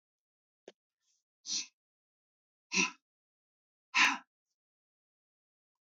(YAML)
exhalation_length: 5.8 s
exhalation_amplitude: 7237
exhalation_signal_mean_std_ratio: 0.22
survey_phase: beta (2021-08-13 to 2022-03-07)
age: 45-64
gender: Male
wearing_mask: 'No'
symptom_cough_any: true
symptom_sore_throat: true
smoker_status: Ex-smoker
respiratory_condition_asthma: false
respiratory_condition_other: false
recruitment_source: REACT
submission_delay: 1 day
covid_test_result: Negative
covid_test_method: RT-qPCR
influenza_a_test_result: Negative
influenza_b_test_result: Negative